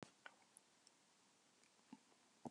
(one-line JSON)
{"exhalation_length": "2.5 s", "exhalation_amplitude": 549, "exhalation_signal_mean_std_ratio": 0.39, "survey_phase": "beta (2021-08-13 to 2022-03-07)", "age": "65+", "gender": "Female", "wearing_mask": "No", "symptom_none": true, "smoker_status": "Ex-smoker", "respiratory_condition_asthma": false, "respiratory_condition_other": false, "recruitment_source": "REACT", "submission_delay": "6 days", "covid_test_result": "Negative", "covid_test_method": "RT-qPCR", "influenza_a_test_result": "Negative", "influenza_b_test_result": "Negative"}